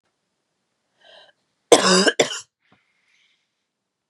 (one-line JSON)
{"cough_length": "4.1 s", "cough_amplitude": 32768, "cough_signal_mean_std_ratio": 0.26, "survey_phase": "beta (2021-08-13 to 2022-03-07)", "age": "45-64", "gender": "Female", "wearing_mask": "No", "symptom_cough_any": true, "symptom_runny_or_blocked_nose": true, "symptom_shortness_of_breath": true, "symptom_sore_throat": true, "symptom_fatigue": true, "symptom_fever_high_temperature": true, "symptom_headache": true, "smoker_status": "Never smoked", "respiratory_condition_asthma": false, "respiratory_condition_other": false, "recruitment_source": "Test and Trace", "submission_delay": "1 day", "covid_test_result": "Positive", "covid_test_method": "ePCR"}